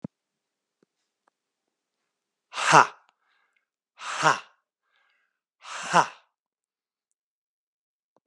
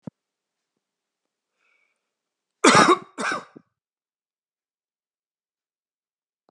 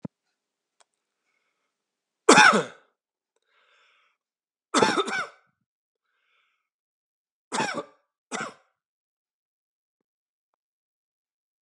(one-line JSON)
{"exhalation_length": "8.3 s", "exhalation_amplitude": 28645, "exhalation_signal_mean_std_ratio": 0.2, "cough_length": "6.5 s", "cough_amplitude": 29126, "cough_signal_mean_std_ratio": 0.2, "three_cough_length": "11.6 s", "three_cough_amplitude": 31786, "three_cough_signal_mean_std_ratio": 0.21, "survey_phase": "beta (2021-08-13 to 2022-03-07)", "age": "18-44", "gender": "Male", "wearing_mask": "No", "symptom_cough_any": true, "symptom_runny_or_blocked_nose": true, "symptom_diarrhoea": true, "symptom_fatigue": true, "symptom_headache": true, "smoker_status": "Never smoked", "respiratory_condition_asthma": false, "respiratory_condition_other": false, "recruitment_source": "Test and Trace", "submission_delay": "2 days", "covid_test_result": "Positive", "covid_test_method": "RT-qPCR", "covid_ct_value": 22.5, "covid_ct_gene": "N gene"}